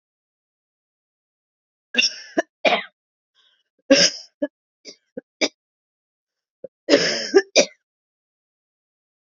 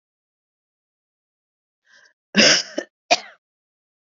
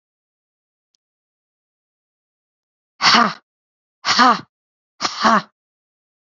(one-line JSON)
{"three_cough_length": "9.2 s", "three_cough_amplitude": 31674, "three_cough_signal_mean_std_ratio": 0.27, "cough_length": "4.2 s", "cough_amplitude": 32768, "cough_signal_mean_std_ratio": 0.23, "exhalation_length": "6.3 s", "exhalation_amplitude": 29492, "exhalation_signal_mean_std_ratio": 0.29, "survey_phase": "alpha (2021-03-01 to 2021-08-12)", "age": "18-44", "gender": "Female", "wearing_mask": "No", "symptom_none": true, "smoker_status": "Current smoker (1 to 10 cigarettes per day)", "respiratory_condition_asthma": false, "respiratory_condition_other": false, "recruitment_source": "REACT", "submission_delay": "1 day", "covid_test_result": "Negative", "covid_test_method": "RT-qPCR"}